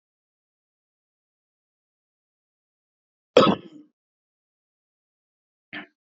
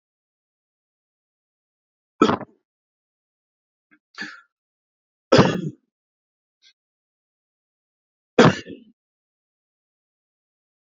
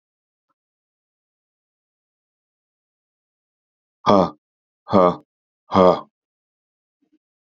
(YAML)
cough_length: 6.1 s
cough_amplitude: 26889
cough_signal_mean_std_ratio: 0.14
three_cough_length: 10.8 s
three_cough_amplitude: 32767
three_cough_signal_mean_std_ratio: 0.18
exhalation_length: 7.6 s
exhalation_amplitude: 28519
exhalation_signal_mean_std_ratio: 0.22
survey_phase: beta (2021-08-13 to 2022-03-07)
age: 65+
gender: Male
wearing_mask: 'Yes'
symptom_new_continuous_cough: true
symptom_shortness_of_breath: true
symptom_sore_throat: true
symptom_abdominal_pain: true
symptom_fatigue: true
symptom_change_to_sense_of_smell_or_taste: true
smoker_status: Ex-smoker
respiratory_condition_asthma: false
respiratory_condition_other: true
recruitment_source: Test and Trace
submission_delay: 2 days
covid_test_result: Positive
covid_test_method: RT-qPCR
covid_ct_value: 35.2
covid_ct_gene: N gene
covid_ct_mean: 35.5
covid_viral_load: 2.3 copies/ml
covid_viral_load_category: Minimal viral load (< 10K copies/ml)